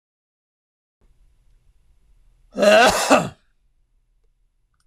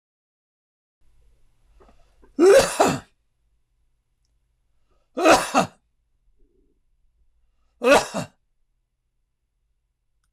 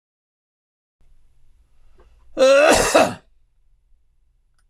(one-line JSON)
{"exhalation_length": "4.9 s", "exhalation_amplitude": 26000, "exhalation_signal_mean_std_ratio": 0.3, "three_cough_length": "10.3 s", "three_cough_amplitude": 22160, "three_cough_signal_mean_std_ratio": 0.27, "cough_length": "4.7 s", "cough_amplitude": 24621, "cough_signal_mean_std_ratio": 0.34, "survey_phase": "beta (2021-08-13 to 2022-03-07)", "age": "65+", "gender": "Male", "wearing_mask": "No", "symptom_none": true, "smoker_status": "Ex-smoker", "respiratory_condition_asthma": false, "respiratory_condition_other": false, "recruitment_source": "REACT", "submission_delay": "4 days", "covid_test_result": "Negative", "covid_test_method": "RT-qPCR", "influenza_a_test_result": "Negative", "influenza_b_test_result": "Negative"}